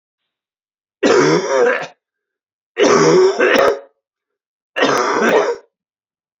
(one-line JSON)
{"three_cough_length": "6.4 s", "three_cough_amplitude": 32768, "three_cough_signal_mean_std_ratio": 0.56, "survey_phase": "beta (2021-08-13 to 2022-03-07)", "age": "45-64", "gender": "Male", "wearing_mask": "No", "symptom_cough_any": true, "symptom_fatigue": true, "symptom_onset": "5 days", "smoker_status": "Never smoked", "respiratory_condition_asthma": true, "respiratory_condition_other": false, "recruitment_source": "Test and Trace", "submission_delay": "2 days", "covid_test_result": "Positive", "covid_test_method": "RT-qPCR", "covid_ct_value": 22.8, "covid_ct_gene": "S gene", "covid_ct_mean": 23.2, "covid_viral_load": "24000 copies/ml", "covid_viral_load_category": "Low viral load (10K-1M copies/ml)"}